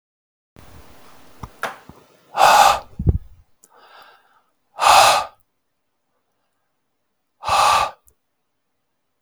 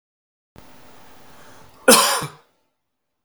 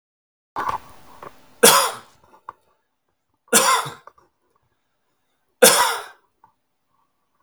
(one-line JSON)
{"exhalation_length": "9.2 s", "exhalation_amplitude": 32768, "exhalation_signal_mean_std_ratio": 0.33, "cough_length": "3.2 s", "cough_amplitude": 32768, "cough_signal_mean_std_ratio": 0.27, "three_cough_length": "7.4 s", "three_cough_amplitude": 32768, "three_cough_signal_mean_std_ratio": 0.3, "survey_phase": "beta (2021-08-13 to 2022-03-07)", "age": "45-64", "gender": "Male", "wearing_mask": "No", "symptom_none": true, "smoker_status": "Never smoked", "respiratory_condition_asthma": false, "respiratory_condition_other": false, "recruitment_source": "REACT", "submission_delay": "2 days", "covid_test_result": "Negative", "covid_test_method": "RT-qPCR", "influenza_a_test_result": "Negative", "influenza_b_test_result": "Negative"}